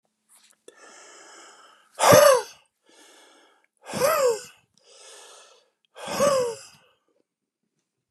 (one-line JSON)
{"exhalation_length": "8.1 s", "exhalation_amplitude": 29134, "exhalation_signal_mean_std_ratio": 0.32, "survey_phase": "beta (2021-08-13 to 2022-03-07)", "age": "65+", "gender": "Male", "wearing_mask": "No", "symptom_cough_any": true, "smoker_status": "Never smoked", "respiratory_condition_asthma": false, "respiratory_condition_other": false, "recruitment_source": "REACT", "submission_delay": "2 days", "covid_test_result": "Negative", "covid_test_method": "RT-qPCR", "influenza_a_test_result": "Negative", "influenza_b_test_result": "Negative"}